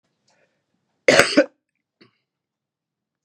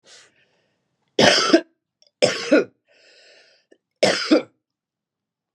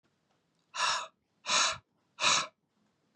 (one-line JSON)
{"cough_length": "3.2 s", "cough_amplitude": 32768, "cough_signal_mean_std_ratio": 0.22, "three_cough_length": "5.5 s", "three_cough_amplitude": 32768, "three_cough_signal_mean_std_ratio": 0.34, "exhalation_length": "3.2 s", "exhalation_amplitude": 6956, "exhalation_signal_mean_std_ratio": 0.41, "survey_phase": "beta (2021-08-13 to 2022-03-07)", "age": "45-64", "gender": "Female", "wearing_mask": "No", "symptom_none": true, "symptom_onset": "12 days", "smoker_status": "Current smoker (e-cigarettes or vapes only)", "respiratory_condition_asthma": false, "respiratory_condition_other": false, "recruitment_source": "REACT", "submission_delay": "2 days", "covid_test_result": "Negative", "covid_test_method": "RT-qPCR", "influenza_a_test_result": "Negative", "influenza_b_test_result": "Negative"}